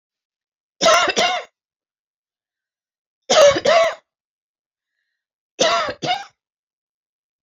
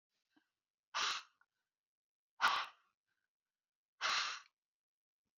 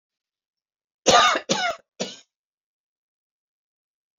three_cough_length: 7.4 s
three_cough_amplitude: 28170
three_cough_signal_mean_std_ratio: 0.37
exhalation_length: 5.4 s
exhalation_amplitude: 3732
exhalation_signal_mean_std_ratio: 0.31
cough_length: 4.2 s
cough_amplitude: 22882
cough_signal_mean_std_ratio: 0.29
survey_phase: beta (2021-08-13 to 2022-03-07)
age: 45-64
gender: Female
wearing_mask: 'No'
symptom_headache: true
smoker_status: Never smoked
respiratory_condition_asthma: false
respiratory_condition_other: false
recruitment_source: REACT
submission_delay: 1 day
covid_test_result: Negative
covid_test_method: RT-qPCR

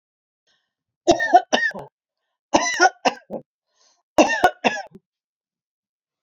three_cough_length: 6.2 s
three_cough_amplitude: 27733
three_cough_signal_mean_std_ratio: 0.33
survey_phase: beta (2021-08-13 to 2022-03-07)
age: 65+
gender: Female
wearing_mask: 'No'
symptom_none: true
smoker_status: Ex-smoker
respiratory_condition_asthma: false
respiratory_condition_other: false
recruitment_source: REACT
submission_delay: 3 days
covid_test_result: Negative
covid_test_method: RT-qPCR
influenza_a_test_result: Negative
influenza_b_test_result: Negative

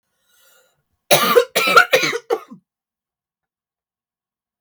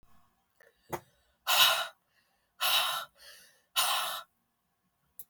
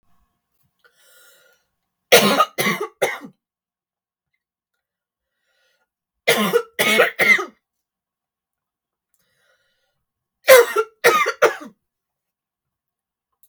cough_length: 4.6 s
cough_amplitude: 32767
cough_signal_mean_std_ratio: 0.34
exhalation_length: 5.3 s
exhalation_amplitude: 12641
exhalation_signal_mean_std_ratio: 0.39
three_cough_length: 13.5 s
three_cough_amplitude: 32768
three_cough_signal_mean_std_ratio: 0.3
survey_phase: beta (2021-08-13 to 2022-03-07)
age: 18-44
gender: Female
wearing_mask: 'No'
symptom_none: true
smoker_status: Never smoked
respiratory_condition_asthma: false
respiratory_condition_other: false
recruitment_source: REACT
submission_delay: 1 day
covid_test_result: Negative
covid_test_method: RT-qPCR
influenza_a_test_result: Negative
influenza_b_test_result: Negative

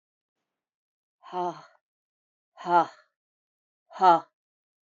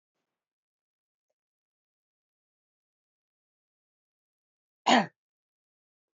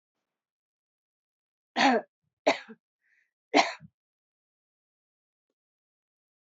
exhalation_length: 4.9 s
exhalation_amplitude: 15269
exhalation_signal_mean_std_ratio: 0.24
cough_length: 6.1 s
cough_amplitude: 11750
cough_signal_mean_std_ratio: 0.13
three_cough_length: 6.5 s
three_cough_amplitude: 18775
three_cough_signal_mean_std_ratio: 0.21
survey_phase: beta (2021-08-13 to 2022-03-07)
age: 65+
gender: Female
wearing_mask: 'No'
symptom_cough_any: true
symptom_runny_or_blocked_nose: true
symptom_fatigue: true
symptom_headache: true
symptom_onset: 4 days
smoker_status: Never smoked
respiratory_condition_asthma: false
respiratory_condition_other: false
recruitment_source: REACT
submission_delay: 2 days
covid_test_result: Negative
covid_test_method: RT-qPCR
influenza_a_test_result: Negative
influenza_b_test_result: Negative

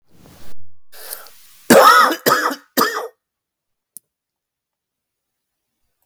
cough_length: 6.1 s
cough_amplitude: 32768
cough_signal_mean_std_ratio: 0.36
survey_phase: beta (2021-08-13 to 2022-03-07)
age: 18-44
gender: Male
wearing_mask: 'No'
symptom_cough_any: true
symptom_fatigue: true
symptom_headache: true
symptom_change_to_sense_of_smell_or_taste: true
symptom_loss_of_taste: true
symptom_onset: 5 days
smoker_status: Never smoked
respiratory_condition_asthma: false
respiratory_condition_other: false
recruitment_source: Test and Trace
submission_delay: 1 day
covid_test_result: Positive
covid_test_method: RT-qPCR
covid_ct_value: 29.7
covid_ct_gene: ORF1ab gene
covid_ct_mean: 30.1
covid_viral_load: 130 copies/ml
covid_viral_load_category: Minimal viral load (< 10K copies/ml)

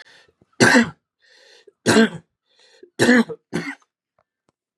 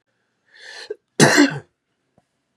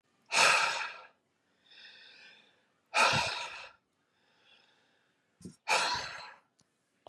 three_cough_length: 4.8 s
three_cough_amplitude: 31416
three_cough_signal_mean_std_ratio: 0.35
cough_length: 2.6 s
cough_amplitude: 32767
cough_signal_mean_std_ratio: 0.3
exhalation_length: 7.1 s
exhalation_amplitude: 9875
exhalation_signal_mean_std_ratio: 0.38
survey_phase: beta (2021-08-13 to 2022-03-07)
age: 45-64
gender: Male
wearing_mask: 'No'
symptom_cough_any: true
symptom_runny_or_blocked_nose: true
smoker_status: Ex-smoker
respiratory_condition_asthma: true
respiratory_condition_other: false
recruitment_source: Test and Trace
submission_delay: 2 days
covid_test_result: Positive
covid_test_method: RT-qPCR
covid_ct_value: 30.0
covid_ct_gene: N gene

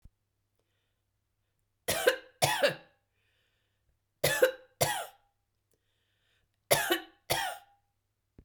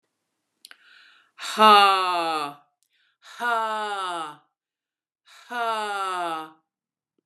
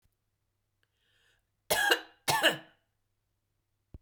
three_cough_length: 8.4 s
three_cough_amplitude: 13102
three_cough_signal_mean_std_ratio: 0.32
exhalation_length: 7.3 s
exhalation_amplitude: 25999
exhalation_signal_mean_std_ratio: 0.41
cough_length: 4.0 s
cough_amplitude: 11820
cough_signal_mean_std_ratio: 0.29
survey_phase: beta (2021-08-13 to 2022-03-07)
age: 65+
gender: Female
wearing_mask: 'No'
symptom_none: true
smoker_status: Never smoked
respiratory_condition_asthma: false
respiratory_condition_other: false
recruitment_source: REACT
submission_delay: 1 day
covid_test_result: Negative
covid_test_method: RT-qPCR
influenza_a_test_result: Unknown/Void
influenza_b_test_result: Unknown/Void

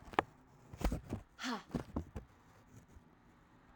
exhalation_length: 3.8 s
exhalation_amplitude: 7668
exhalation_signal_mean_std_ratio: 0.39
survey_phase: alpha (2021-03-01 to 2021-08-12)
age: 18-44
gender: Female
wearing_mask: 'No'
symptom_cough_any: true
symptom_fatigue: true
symptom_headache: true
smoker_status: Never smoked
respiratory_condition_asthma: false
respiratory_condition_other: false
recruitment_source: Test and Trace
submission_delay: 1 day
covid_test_result: Positive
covid_test_method: RT-qPCR
covid_ct_value: 17.3
covid_ct_gene: ORF1ab gene
covid_ct_mean: 18.6
covid_viral_load: 800000 copies/ml
covid_viral_load_category: Low viral load (10K-1M copies/ml)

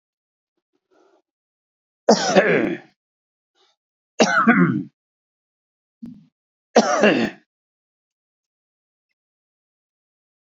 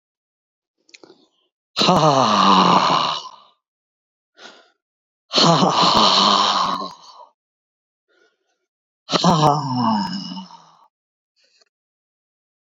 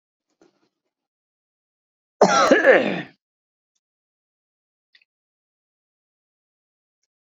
three_cough_length: 10.6 s
three_cough_amplitude: 28161
three_cough_signal_mean_std_ratio: 0.31
exhalation_length: 12.7 s
exhalation_amplitude: 29281
exhalation_signal_mean_std_ratio: 0.47
cough_length: 7.3 s
cough_amplitude: 26350
cough_signal_mean_std_ratio: 0.24
survey_phase: beta (2021-08-13 to 2022-03-07)
age: 65+
gender: Male
wearing_mask: 'No'
symptom_runny_or_blocked_nose: true
symptom_sore_throat: true
symptom_fatigue: true
symptom_onset: 7 days
smoker_status: Ex-smoker
respiratory_condition_asthma: false
respiratory_condition_other: false
recruitment_source: REACT
submission_delay: 1 day
covid_test_result: Negative
covid_test_method: RT-qPCR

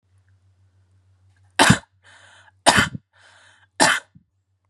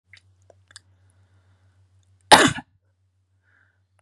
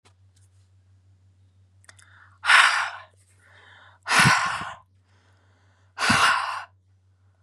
three_cough_length: 4.7 s
three_cough_amplitude: 32767
three_cough_signal_mean_std_ratio: 0.27
cough_length: 4.0 s
cough_amplitude: 32768
cough_signal_mean_std_ratio: 0.17
exhalation_length: 7.4 s
exhalation_amplitude: 26023
exhalation_signal_mean_std_ratio: 0.37
survey_phase: beta (2021-08-13 to 2022-03-07)
age: 18-44
gender: Female
wearing_mask: 'No'
symptom_none: true
smoker_status: Ex-smoker
respiratory_condition_asthma: true
respiratory_condition_other: false
recruitment_source: REACT
submission_delay: 2 days
covid_test_result: Negative
covid_test_method: RT-qPCR
influenza_a_test_result: Negative
influenza_b_test_result: Negative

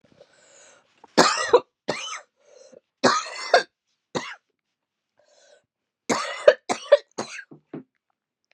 three_cough_length: 8.5 s
three_cough_amplitude: 32670
three_cough_signal_mean_std_ratio: 0.28
survey_phase: beta (2021-08-13 to 2022-03-07)
age: 45-64
gender: Female
wearing_mask: 'No'
symptom_cough_any: true
symptom_runny_or_blocked_nose: true
symptom_sore_throat: true
symptom_fatigue: true
symptom_fever_high_temperature: true
symptom_headache: true
symptom_change_to_sense_of_smell_or_taste: true
symptom_loss_of_taste: true
symptom_onset: 5 days
smoker_status: Never smoked
respiratory_condition_asthma: false
respiratory_condition_other: false
recruitment_source: Test and Trace
submission_delay: 1 day
covid_test_result: Positive
covid_test_method: RT-qPCR
covid_ct_value: 23.3
covid_ct_gene: ORF1ab gene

